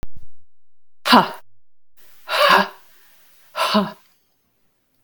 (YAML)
exhalation_length: 5.0 s
exhalation_amplitude: 32768
exhalation_signal_mean_std_ratio: 0.44
survey_phase: beta (2021-08-13 to 2022-03-07)
age: 45-64
gender: Female
wearing_mask: 'No'
symptom_none: true
smoker_status: Ex-smoker
respiratory_condition_asthma: true
respiratory_condition_other: false
recruitment_source: REACT
submission_delay: 4 days
covid_test_result: Negative
covid_test_method: RT-qPCR
influenza_a_test_result: Negative
influenza_b_test_result: Negative